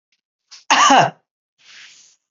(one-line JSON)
{"cough_length": "2.3 s", "cough_amplitude": 29759, "cough_signal_mean_std_ratio": 0.35, "survey_phase": "beta (2021-08-13 to 2022-03-07)", "age": "65+", "gender": "Female", "wearing_mask": "No", "symptom_none": true, "smoker_status": "Never smoked", "respiratory_condition_asthma": false, "respiratory_condition_other": false, "recruitment_source": "REACT", "submission_delay": "1 day", "covid_test_result": "Negative", "covid_test_method": "RT-qPCR"}